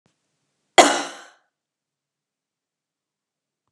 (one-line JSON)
{"cough_length": "3.7 s", "cough_amplitude": 32768, "cough_signal_mean_std_ratio": 0.17, "survey_phase": "beta (2021-08-13 to 2022-03-07)", "age": "45-64", "gender": "Female", "wearing_mask": "No", "symptom_none": true, "smoker_status": "Never smoked", "respiratory_condition_asthma": false, "respiratory_condition_other": false, "recruitment_source": "REACT", "submission_delay": "1 day", "covid_test_result": "Negative", "covid_test_method": "RT-qPCR", "influenza_a_test_result": "Negative", "influenza_b_test_result": "Negative"}